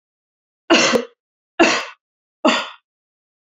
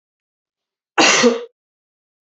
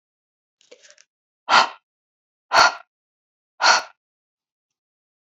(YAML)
three_cough_length: 3.6 s
three_cough_amplitude: 27652
three_cough_signal_mean_std_ratio: 0.36
cough_length: 2.3 s
cough_amplitude: 30070
cough_signal_mean_std_ratio: 0.34
exhalation_length: 5.2 s
exhalation_amplitude: 31675
exhalation_signal_mean_std_ratio: 0.26
survey_phase: beta (2021-08-13 to 2022-03-07)
age: 18-44
gender: Female
wearing_mask: 'No'
symptom_runny_or_blocked_nose: true
symptom_sore_throat: true
symptom_headache: true
symptom_onset: 4 days
smoker_status: Never smoked
respiratory_condition_asthma: false
respiratory_condition_other: false
recruitment_source: Test and Trace
submission_delay: 2 days
covid_test_result: Positive
covid_test_method: RT-qPCR
covid_ct_value: 20.3
covid_ct_gene: ORF1ab gene
covid_ct_mean: 21.0
covid_viral_load: 130000 copies/ml
covid_viral_load_category: Low viral load (10K-1M copies/ml)